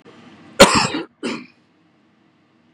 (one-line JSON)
{"cough_length": "2.7 s", "cough_amplitude": 32768, "cough_signal_mean_std_ratio": 0.29, "survey_phase": "beta (2021-08-13 to 2022-03-07)", "age": "45-64", "gender": "Male", "wearing_mask": "No", "symptom_none": true, "smoker_status": "Ex-smoker", "respiratory_condition_asthma": false, "respiratory_condition_other": true, "recruitment_source": "REACT", "submission_delay": "1 day", "covid_test_result": "Negative", "covid_test_method": "RT-qPCR"}